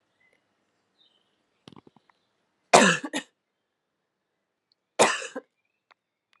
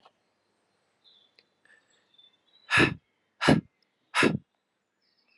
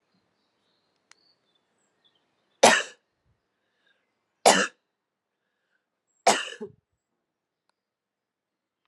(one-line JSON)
{"cough_length": "6.4 s", "cough_amplitude": 30359, "cough_signal_mean_std_ratio": 0.21, "exhalation_length": "5.4 s", "exhalation_amplitude": 16538, "exhalation_signal_mean_std_ratio": 0.26, "three_cough_length": "8.9 s", "three_cough_amplitude": 26089, "three_cough_signal_mean_std_ratio": 0.19, "survey_phase": "alpha (2021-03-01 to 2021-08-12)", "age": "18-44", "gender": "Female", "wearing_mask": "No", "symptom_cough_any": true, "symptom_diarrhoea": true, "symptom_fatigue": true, "symptom_change_to_sense_of_smell_or_taste": true, "symptom_loss_of_taste": true, "symptom_onset": "4 days", "smoker_status": "Ex-smoker", "respiratory_condition_asthma": false, "respiratory_condition_other": false, "recruitment_source": "Test and Trace", "submission_delay": "1 day", "covid_test_result": "Positive", "covid_test_method": "RT-qPCR"}